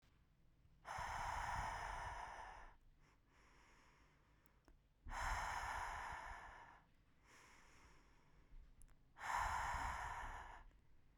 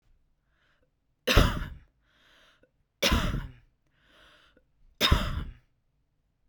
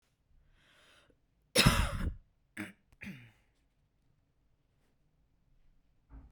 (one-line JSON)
{"exhalation_length": "11.2 s", "exhalation_amplitude": 971, "exhalation_signal_mean_std_ratio": 0.63, "three_cough_length": "6.5 s", "three_cough_amplitude": 16441, "three_cough_signal_mean_std_ratio": 0.32, "cough_length": "6.3 s", "cough_amplitude": 10206, "cough_signal_mean_std_ratio": 0.25, "survey_phase": "beta (2021-08-13 to 2022-03-07)", "age": "18-44", "gender": "Female", "wearing_mask": "No", "symptom_cough_any": true, "symptom_runny_or_blocked_nose": true, "symptom_sore_throat": true, "symptom_fatigue": true, "symptom_headache": true, "symptom_onset": "12 days", "smoker_status": "Never smoked", "respiratory_condition_asthma": false, "respiratory_condition_other": false, "recruitment_source": "REACT", "submission_delay": "1 day", "covid_test_result": "Negative", "covid_test_method": "RT-qPCR", "influenza_a_test_result": "Negative", "influenza_b_test_result": "Negative"}